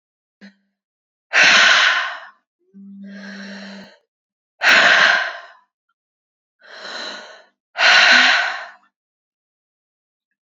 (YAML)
exhalation_length: 10.6 s
exhalation_amplitude: 30567
exhalation_signal_mean_std_ratio: 0.41
survey_phase: beta (2021-08-13 to 2022-03-07)
age: 18-44
gender: Female
wearing_mask: 'No'
symptom_cough_any: true
symptom_runny_or_blocked_nose: true
symptom_fatigue: true
symptom_onset: 2 days
smoker_status: Never smoked
respiratory_condition_asthma: false
respiratory_condition_other: false
recruitment_source: Test and Trace
submission_delay: 1 day
covid_test_result: Positive
covid_test_method: ePCR